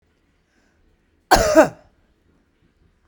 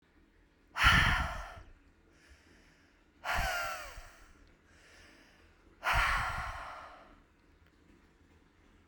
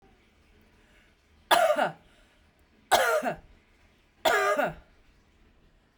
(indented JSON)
{
  "cough_length": "3.1 s",
  "cough_amplitude": 32768,
  "cough_signal_mean_std_ratio": 0.26,
  "exhalation_length": "8.9 s",
  "exhalation_amplitude": 8877,
  "exhalation_signal_mean_std_ratio": 0.39,
  "three_cough_length": "6.0 s",
  "three_cough_amplitude": 17241,
  "three_cough_signal_mean_std_ratio": 0.39,
  "survey_phase": "beta (2021-08-13 to 2022-03-07)",
  "age": "18-44",
  "gender": "Female",
  "wearing_mask": "No",
  "symptom_sore_throat": true,
  "smoker_status": "Ex-smoker",
  "respiratory_condition_asthma": false,
  "respiratory_condition_other": false,
  "recruitment_source": "Test and Trace",
  "submission_delay": "1 day",
  "covid_test_result": "Negative",
  "covid_test_method": "RT-qPCR"
}